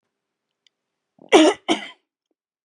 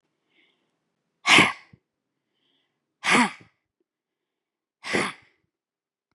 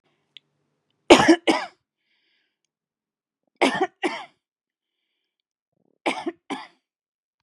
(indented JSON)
{
  "cough_length": "2.6 s",
  "cough_amplitude": 32653,
  "cough_signal_mean_std_ratio": 0.26,
  "exhalation_length": "6.1 s",
  "exhalation_amplitude": 23576,
  "exhalation_signal_mean_std_ratio": 0.25,
  "three_cough_length": "7.4 s",
  "three_cough_amplitude": 32767,
  "three_cough_signal_mean_std_ratio": 0.23,
  "survey_phase": "beta (2021-08-13 to 2022-03-07)",
  "age": "45-64",
  "gender": "Female",
  "wearing_mask": "No",
  "symptom_none": true,
  "smoker_status": "Never smoked",
  "respiratory_condition_asthma": false,
  "respiratory_condition_other": false,
  "recruitment_source": "REACT",
  "submission_delay": "1 day",
  "covid_test_result": "Negative",
  "covid_test_method": "RT-qPCR",
  "influenza_a_test_result": "Negative",
  "influenza_b_test_result": "Negative"
}